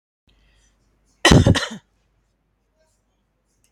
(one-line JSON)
{"cough_length": "3.7 s", "cough_amplitude": 32767, "cough_signal_mean_std_ratio": 0.24, "survey_phase": "beta (2021-08-13 to 2022-03-07)", "age": "65+", "gender": "Female", "wearing_mask": "No", "symptom_none": true, "smoker_status": "Ex-smoker", "respiratory_condition_asthma": false, "respiratory_condition_other": false, "recruitment_source": "REACT", "submission_delay": "1 day", "covid_test_result": "Negative", "covid_test_method": "RT-qPCR", "influenza_a_test_result": "Unknown/Void", "influenza_b_test_result": "Unknown/Void"}